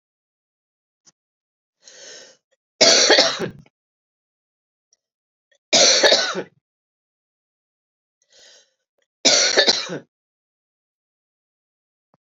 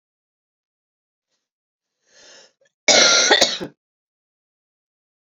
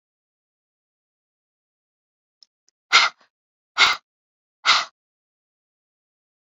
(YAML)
three_cough_length: 12.2 s
three_cough_amplitude: 32767
three_cough_signal_mean_std_ratio: 0.3
cough_length: 5.4 s
cough_amplitude: 32768
cough_signal_mean_std_ratio: 0.28
exhalation_length: 6.5 s
exhalation_amplitude: 29928
exhalation_signal_mean_std_ratio: 0.21
survey_phase: beta (2021-08-13 to 2022-03-07)
age: 45-64
gender: Female
wearing_mask: 'No'
symptom_runny_or_blocked_nose: true
smoker_status: Never smoked
respiratory_condition_asthma: true
respiratory_condition_other: false
recruitment_source: Test and Trace
submission_delay: 2 days
covid_test_result: Positive
covid_test_method: RT-qPCR
covid_ct_value: 18.2
covid_ct_gene: ORF1ab gene
covid_ct_mean: 18.4
covid_viral_load: 920000 copies/ml
covid_viral_load_category: Low viral load (10K-1M copies/ml)